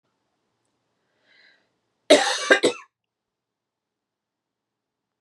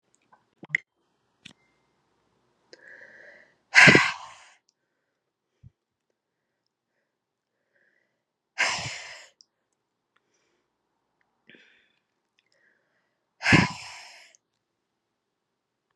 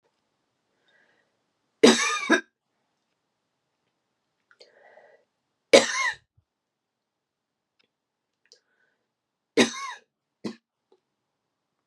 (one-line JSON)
{"cough_length": "5.2 s", "cough_amplitude": 30018, "cough_signal_mean_std_ratio": 0.22, "exhalation_length": "16.0 s", "exhalation_amplitude": 30954, "exhalation_signal_mean_std_ratio": 0.18, "three_cough_length": "11.9 s", "three_cough_amplitude": 29815, "three_cough_signal_mean_std_ratio": 0.2, "survey_phase": "beta (2021-08-13 to 2022-03-07)", "age": "18-44", "gender": "Female", "wearing_mask": "No", "symptom_runny_or_blocked_nose": true, "symptom_shortness_of_breath": true, "symptom_abdominal_pain": true, "symptom_fatigue": true, "symptom_headache": true, "symptom_change_to_sense_of_smell_or_taste": true, "symptom_loss_of_taste": true, "symptom_other": true, "symptom_onset": "3 days", "smoker_status": "Never smoked", "respiratory_condition_asthma": false, "respiratory_condition_other": false, "recruitment_source": "Test and Trace", "submission_delay": "1 day", "covid_test_result": "Positive", "covid_test_method": "ePCR"}